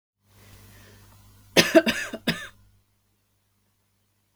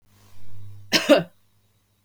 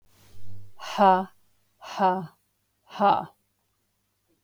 {"three_cough_length": "4.4 s", "three_cough_amplitude": 32221, "three_cough_signal_mean_std_ratio": 0.25, "cough_length": "2.0 s", "cough_amplitude": 26846, "cough_signal_mean_std_ratio": 0.41, "exhalation_length": "4.4 s", "exhalation_amplitude": 16726, "exhalation_signal_mean_std_ratio": 0.41, "survey_phase": "beta (2021-08-13 to 2022-03-07)", "age": "18-44", "gender": "Female", "wearing_mask": "No", "symptom_none": true, "symptom_onset": "3 days", "smoker_status": "Never smoked", "respiratory_condition_asthma": true, "respiratory_condition_other": false, "recruitment_source": "REACT", "submission_delay": "2 days", "covid_test_result": "Negative", "covid_test_method": "RT-qPCR"}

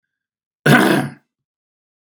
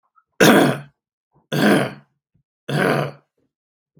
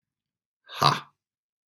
{"cough_length": "2.0 s", "cough_amplitude": 32767, "cough_signal_mean_std_ratio": 0.35, "three_cough_length": "4.0 s", "three_cough_amplitude": 32768, "three_cough_signal_mean_std_ratio": 0.41, "exhalation_length": "1.7 s", "exhalation_amplitude": 22834, "exhalation_signal_mean_std_ratio": 0.24, "survey_phase": "beta (2021-08-13 to 2022-03-07)", "age": "45-64", "gender": "Male", "wearing_mask": "No", "symptom_none": true, "smoker_status": "Ex-smoker", "respiratory_condition_asthma": false, "respiratory_condition_other": false, "recruitment_source": "REACT", "submission_delay": "1 day", "covid_test_result": "Negative", "covid_test_method": "RT-qPCR", "influenza_a_test_result": "Negative", "influenza_b_test_result": "Negative"}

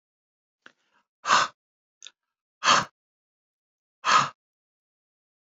{"exhalation_length": "5.5 s", "exhalation_amplitude": 20031, "exhalation_signal_mean_std_ratio": 0.26, "survey_phase": "beta (2021-08-13 to 2022-03-07)", "age": "45-64", "gender": "Male", "wearing_mask": "No", "symptom_none": true, "smoker_status": "Never smoked", "respiratory_condition_asthma": false, "respiratory_condition_other": false, "recruitment_source": "Test and Trace", "submission_delay": "0 days", "covid_test_result": "Negative", "covid_test_method": "LFT"}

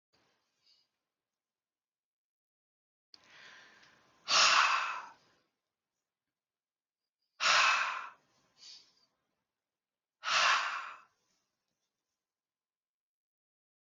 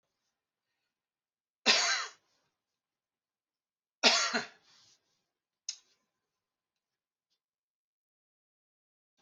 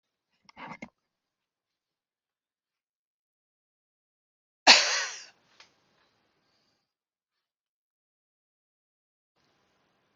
{"exhalation_length": "13.8 s", "exhalation_amplitude": 6971, "exhalation_signal_mean_std_ratio": 0.29, "three_cough_length": "9.2 s", "three_cough_amplitude": 11546, "three_cough_signal_mean_std_ratio": 0.22, "cough_length": "10.2 s", "cough_amplitude": 26607, "cough_signal_mean_std_ratio": 0.14, "survey_phase": "beta (2021-08-13 to 2022-03-07)", "age": "65+", "gender": "Male", "wearing_mask": "No", "symptom_none": true, "smoker_status": "Ex-smoker", "respiratory_condition_asthma": false, "respiratory_condition_other": false, "recruitment_source": "REACT", "submission_delay": "10 days", "covid_test_result": "Negative", "covid_test_method": "RT-qPCR"}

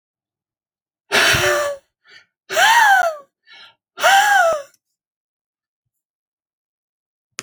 {"exhalation_length": "7.4 s", "exhalation_amplitude": 26837, "exhalation_signal_mean_std_ratio": 0.42, "survey_phase": "alpha (2021-03-01 to 2021-08-12)", "age": "18-44", "gender": "Male", "wearing_mask": "No", "symptom_cough_any": true, "symptom_onset": "10 days", "smoker_status": "Never smoked", "respiratory_condition_asthma": false, "respiratory_condition_other": false, "recruitment_source": "REACT", "submission_delay": "1 day", "covid_test_result": "Negative", "covid_test_method": "RT-qPCR"}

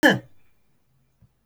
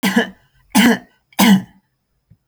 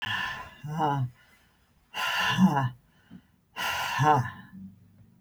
{"cough_length": "1.5 s", "cough_amplitude": 24467, "cough_signal_mean_std_ratio": 0.26, "three_cough_length": "2.5 s", "three_cough_amplitude": 29857, "three_cough_signal_mean_std_ratio": 0.44, "exhalation_length": "5.2 s", "exhalation_amplitude": 11235, "exhalation_signal_mean_std_ratio": 0.56, "survey_phase": "alpha (2021-03-01 to 2021-08-12)", "age": "65+", "gender": "Female", "wearing_mask": "No", "symptom_none": true, "smoker_status": "Never smoked", "respiratory_condition_asthma": false, "respiratory_condition_other": false, "recruitment_source": "REACT", "submission_delay": "2 days", "covid_test_method": "RT-qPCR"}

